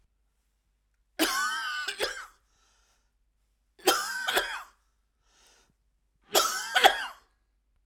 {"three_cough_length": "7.9 s", "three_cough_amplitude": 25091, "three_cough_signal_mean_std_ratio": 0.37, "survey_phase": "alpha (2021-03-01 to 2021-08-12)", "age": "45-64", "gender": "Female", "wearing_mask": "No", "symptom_none": true, "smoker_status": "Never smoked", "respiratory_condition_asthma": false, "respiratory_condition_other": false, "recruitment_source": "Test and Trace", "submission_delay": "98 days", "covid_test_result": "Negative", "covid_test_method": "LFT"}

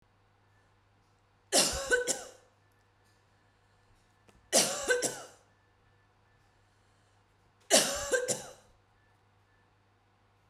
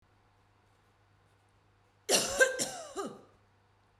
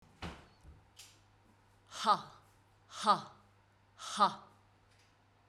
{"three_cough_length": "10.5 s", "three_cough_amplitude": 11363, "three_cough_signal_mean_std_ratio": 0.32, "cough_length": "4.0 s", "cough_amplitude": 8754, "cough_signal_mean_std_ratio": 0.32, "exhalation_length": "5.5 s", "exhalation_amplitude": 6848, "exhalation_signal_mean_std_ratio": 0.29, "survey_phase": "beta (2021-08-13 to 2022-03-07)", "age": "45-64", "gender": "Female", "wearing_mask": "No", "symptom_cough_any": true, "symptom_runny_or_blocked_nose": true, "symptom_fatigue": true, "symptom_headache": true, "symptom_onset": "7 days", "smoker_status": "Ex-smoker", "respiratory_condition_asthma": false, "respiratory_condition_other": false, "recruitment_source": "REACT", "submission_delay": "2 days", "covid_test_result": "Negative", "covid_test_method": "RT-qPCR", "influenza_a_test_result": "Negative", "influenza_b_test_result": "Negative"}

